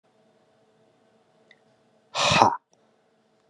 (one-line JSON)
{"exhalation_length": "3.5 s", "exhalation_amplitude": 32279, "exhalation_signal_mean_std_ratio": 0.26, "survey_phase": "beta (2021-08-13 to 2022-03-07)", "age": "18-44", "gender": "Male", "wearing_mask": "No", "symptom_none": true, "smoker_status": "Ex-smoker", "respiratory_condition_asthma": false, "respiratory_condition_other": false, "recruitment_source": "REACT", "submission_delay": "1 day", "covid_test_result": "Negative", "covid_test_method": "RT-qPCR"}